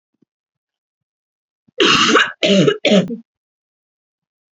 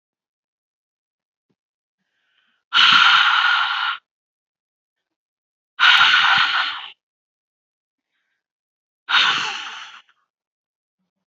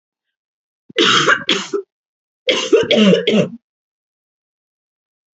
{
  "cough_length": "4.5 s",
  "cough_amplitude": 30475,
  "cough_signal_mean_std_ratio": 0.41,
  "exhalation_length": "11.3 s",
  "exhalation_amplitude": 28976,
  "exhalation_signal_mean_std_ratio": 0.39,
  "three_cough_length": "5.4 s",
  "three_cough_amplitude": 32767,
  "three_cough_signal_mean_std_ratio": 0.44,
  "survey_phase": "alpha (2021-03-01 to 2021-08-12)",
  "age": "18-44",
  "gender": "Female",
  "wearing_mask": "No",
  "symptom_fatigue": true,
  "symptom_headache": true,
  "smoker_status": "Ex-smoker",
  "respiratory_condition_asthma": false,
  "respiratory_condition_other": false,
  "recruitment_source": "REACT",
  "submission_delay": "1 day",
  "covid_test_result": "Negative",
  "covid_test_method": "RT-qPCR"
}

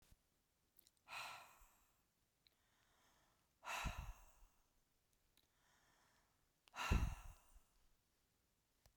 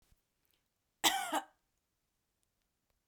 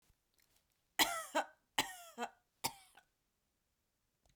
{
  "exhalation_length": "9.0 s",
  "exhalation_amplitude": 1808,
  "exhalation_signal_mean_std_ratio": 0.28,
  "cough_length": "3.1 s",
  "cough_amplitude": 7257,
  "cough_signal_mean_std_ratio": 0.24,
  "three_cough_length": "4.4 s",
  "three_cough_amplitude": 5128,
  "three_cough_signal_mean_std_ratio": 0.27,
  "survey_phase": "beta (2021-08-13 to 2022-03-07)",
  "age": "45-64",
  "gender": "Female",
  "wearing_mask": "No",
  "symptom_none": true,
  "smoker_status": "Ex-smoker",
  "respiratory_condition_asthma": false,
  "respiratory_condition_other": false,
  "recruitment_source": "REACT",
  "submission_delay": "2 days",
  "covid_test_result": "Negative",
  "covid_test_method": "RT-qPCR",
  "influenza_a_test_result": "Negative",
  "influenza_b_test_result": "Negative"
}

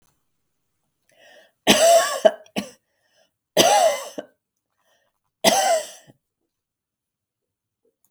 {
  "three_cough_length": "8.1 s",
  "three_cough_amplitude": 32768,
  "three_cough_signal_mean_std_ratio": 0.34,
  "survey_phase": "beta (2021-08-13 to 2022-03-07)",
  "age": "65+",
  "gender": "Female",
  "wearing_mask": "No",
  "symptom_none": true,
  "smoker_status": "Never smoked",
  "respiratory_condition_asthma": false,
  "respiratory_condition_other": false,
  "recruitment_source": "REACT",
  "submission_delay": "3 days",
  "covid_test_result": "Negative",
  "covid_test_method": "RT-qPCR",
  "influenza_a_test_result": "Unknown/Void",
  "influenza_b_test_result": "Unknown/Void"
}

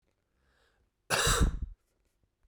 {
  "cough_length": "2.5 s",
  "cough_amplitude": 7308,
  "cough_signal_mean_std_ratio": 0.37,
  "survey_phase": "beta (2021-08-13 to 2022-03-07)",
  "age": "18-44",
  "gender": "Male",
  "wearing_mask": "No",
  "symptom_cough_any": true,
  "symptom_new_continuous_cough": true,
  "symptom_runny_or_blocked_nose": true,
  "symptom_sore_throat": true,
  "symptom_fatigue": true,
  "symptom_headache": true,
  "symptom_onset": "2 days",
  "smoker_status": "Never smoked",
  "respiratory_condition_asthma": false,
  "respiratory_condition_other": false,
  "recruitment_source": "Test and Trace",
  "submission_delay": "2 days",
  "covid_test_result": "Positive",
  "covid_test_method": "RT-qPCR",
  "covid_ct_value": 31.0,
  "covid_ct_gene": "N gene"
}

